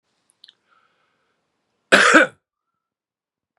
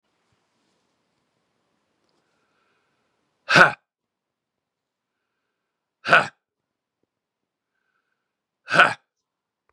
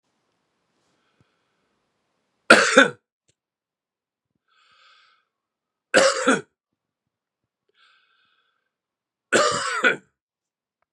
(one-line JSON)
{"cough_length": "3.6 s", "cough_amplitude": 32768, "cough_signal_mean_std_ratio": 0.24, "exhalation_length": "9.7 s", "exhalation_amplitude": 32768, "exhalation_signal_mean_std_ratio": 0.17, "three_cough_length": "10.9 s", "three_cough_amplitude": 32768, "three_cough_signal_mean_std_ratio": 0.25, "survey_phase": "beta (2021-08-13 to 2022-03-07)", "age": "65+", "gender": "Male", "wearing_mask": "No", "symptom_cough_any": true, "symptom_runny_or_blocked_nose": true, "symptom_fatigue": true, "symptom_headache": true, "symptom_change_to_sense_of_smell_or_taste": true, "symptom_onset": "2 days", "smoker_status": "Ex-smoker", "respiratory_condition_asthma": false, "respiratory_condition_other": false, "recruitment_source": "Test and Trace", "submission_delay": "1 day", "covid_test_result": "Positive", "covid_test_method": "RT-qPCR", "covid_ct_value": 16.6, "covid_ct_gene": "N gene"}